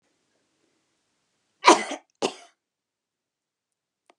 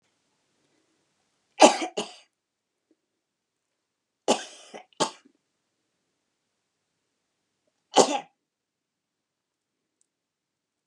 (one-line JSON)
{"cough_length": "4.2 s", "cough_amplitude": 30195, "cough_signal_mean_std_ratio": 0.17, "three_cough_length": "10.9 s", "three_cough_amplitude": 29902, "three_cough_signal_mean_std_ratio": 0.17, "survey_phase": "beta (2021-08-13 to 2022-03-07)", "age": "65+", "gender": "Female", "wearing_mask": "No", "symptom_none": true, "smoker_status": "Never smoked", "respiratory_condition_asthma": false, "respiratory_condition_other": false, "recruitment_source": "REACT", "submission_delay": "1 day", "covid_test_result": "Negative", "covid_test_method": "RT-qPCR"}